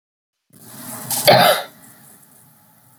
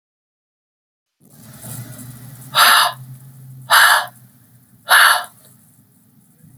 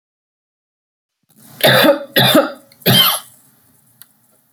{"cough_length": "3.0 s", "cough_amplitude": 32768, "cough_signal_mean_std_ratio": 0.35, "exhalation_length": "6.6 s", "exhalation_amplitude": 32768, "exhalation_signal_mean_std_ratio": 0.37, "three_cough_length": "4.5 s", "three_cough_amplitude": 32768, "three_cough_signal_mean_std_ratio": 0.41, "survey_phase": "beta (2021-08-13 to 2022-03-07)", "age": "45-64", "gender": "Female", "wearing_mask": "No", "symptom_none": true, "smoker_status": "Never smoked", "respiratory_condition_asthma": false, "respiratory_condition_other": false, "recruitment_source": "REACT", "submission_delay": "2 days", "covid_test_result": "Negative", "covid_test_method": "RT-qPCR", "influenza_a_test_result": "Negative", "influenza_b_test_result": "Negative"}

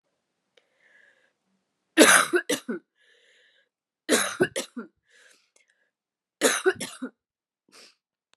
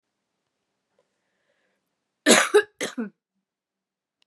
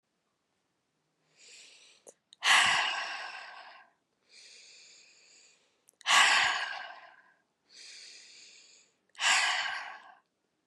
{"three_cough_length": "8.4 s", "three_cough_amplitude": 27819, "three_cough_signal_mean_std_ratio": 0.28, "cough_length": "4.3 s", "cough_amplitude": 27843, "cough_signal_mean_std_ratio": 0.23, "exhalation_length": "10.7 s", "exhalation_amplitude": 10898, "exhalation_signal_mean_std_ratio": 0.37, "survey_phase": "beta (2021-08-13 to 2022-03-07)", "age": "18-44", "gender": "Female", "wearing_mask": "No", "symptom_cough_any": true, "symptom_shortness_of_breath": true, "symptom_sore_throat": true, "symptom_fatigue": true, "symptom_fever_high_temperature": true, "symptom_headache": true, "symptom_other": true, "symptom_onset": "4 days", "smoker_status": "Never smoked", "respiratory_condition_asthma": false, "respiratory_condition_other": false, "recruitment_source": "Test and Trace", "submission_delay": "2 days", "covid_test_result": "Positive", "covid_test_method": "RT-qPCR"}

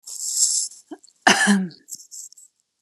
{"cough_length": "2.8 s", "cough_amplitude": 32768, "cough_signal_mean_std_ratio": 0.46, "survey_phase": "beta (2021-08-13 to 2022-03-07)", "age": "65+", "gender": "Female", "wearing_mask": "No", "symptom_none": true, "smoker_status": "Never smoked", "respiratory_condition_asthma": true, "respiratory_condition_other": false, "recruitment_source": "REACT", "submission_delay": "1 day", "covid_test_result": "Negative", "covid_test_method": "RT-qPCR"}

